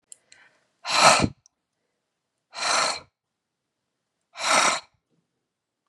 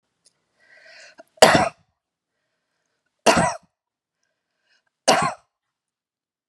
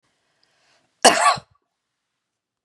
{"exhalation_length": "5.9 s", "exhalation_amplitude": 30789, "exhalation_signal_mean_std_ratio": 0.34, "three_cough_length": "6.5 s", "three_cough_amplitude": 32768, "three_cough_signal_mean_std_ratio": 0.25, "cough_length": "2.6 s", "cough_amplitude": 32653, "cough_signal_mean_std_ratio": 0.25, "survey_phase": "beta (2021-08-13 to 2022-03-07)", "age": "65+", "gender": "Female", "wearing_mask": "No", "symptom_none": true, "smoker_status": "Ex-smoker", "respiratory_condition_asthma": false, "respiratory_condition_other": false, "recruitment_source": "REACT", "submission_delay": "1 day", "covid_test_result": "Negative", "covid_test_method": "RT-qPCR", "influenza_a_test_result": "Negative", "influenza_b_test_result": "Negative"}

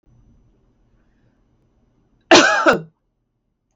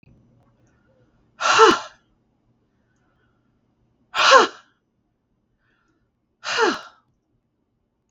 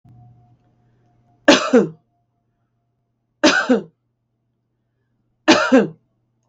{"cough_length": "3.8 s", "cough_amplitude": 32768, "cough_signal_mean_std_ratio": 0.27, "exhalation_length": "8.1 s", "exhalation_amplitude": 32768, "exhalation_signal_mean_std_ratio": 0.26, "three_cough_length": "6.5 s", "three_cough_amplitude": 32768, "three_cough_signal_mean_std_ratio": 0.31, "survey_phase": "beta (2021-08-13 to 2022-03-07)", "age": "65+", "gender": "Female", "wearing_mask": "No", "symptom_none": true, "smoker_status": "Ex-smoker", "respiratory_condition_asthma": false, "respiratory_condition_other": false, "recruitment_source": "REACT", "submission_delay": "5 days", "covid_test_result": "Negative", "covid_test_method": "RT-qPCR", "influenza_a_test_result": "Negative", "influenza_b_test_result": "Negative"}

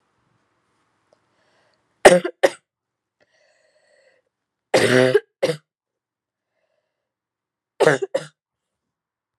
{"three_cough_length": "9.4 s", "three_cough_amplitude": 32768, "three_cough_signal_mean_std_ratio": 0.23, "survey_phase": "alpha (2021-03-01 to 2021-08-12)", "age": "18-44", "gender": "Female", "wearing_mask": "No", "symptom_cough_any": true, "symptom_headache": true, "symptom_onset": "3 days", "smoker_status": "Never smoked", "respiratory_condition_asthma": false, "respiratory_condition_other": false, "recruitment_source": "Test and Trace", "submission_delay": "1 day", "covid_test_result": "Positive"}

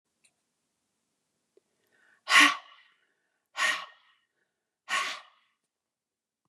{"exhalation_length": "6.5 s", "exhalation_amplitude": 17197, "exhalation_signal_mean_std_ratio": 0.23, "survey_phase": "beta (2021-08-13 to 2022-03-07)", "age": "65+", "gender": "Female", "wearing_mask": "No", "symptom_abdominal_pain": true, "symptom_headache": true, "symptom_onset": "12 days", "smoker_status": "Ex-smoker", "respiratory_condition_asthma": false, "respiratory_condition_other": false, "recruitment_source": "REACT", "submission_delay": "8 days", "covid_test_result": "Negative", "covid_test_method": "RT-qPCR", "influenza_a_test_result": "Negative", "influenza_b_test_result": "Negative"}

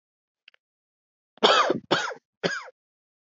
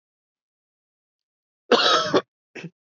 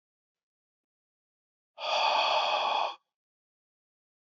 {"three_cough_length": "3.3 s", "three_cough_amplitude": 24269, "three_cough_signal_mean_std_ratio": 0.34, "cough_length": "2.9 s", "cough_amplitude": 24308, "cough_signal_mean_std_ratio": 0.32, "exhalation_length": "4.4 s", "exhalation_amplitude": 5934, "exhalation_signal_mean_std_ratio": 0.43, "survey_phase": "beta (2021-08-13 to 2022-03-07)", "age": "18-44", "gender": "Male", "wearing_mask": "No", "symptom_cough_any": true, "symptom_runny_or_blocked_nose": true, "symptom_sore_throat": true, "symptom_fatigue": true, "symptom_fever_high_temperature": true, "symptom_change_to_sense_of_smell_or_taste": true, "symptom_loss_of_taste": true, "symptom_onset": "3 days", "smoker_status": "Never smoked", "respiratory_condition_asthma": false, "respiratory_condition_other": false, "recruitment_source": "Test and Trace", "submission_delay": "2 days", "covid_test_result": "Positive", "covid_test_method": "RT-qPCR", "covid_ct_value": 17.4, "covid_ct_gene": "ORF1ab gene", "covid_ct_mean": 18.0, "covid_viral_load": "1300000 copies/ml", "covid_viral_load_category": "High viral load (>1M copies/ml)"}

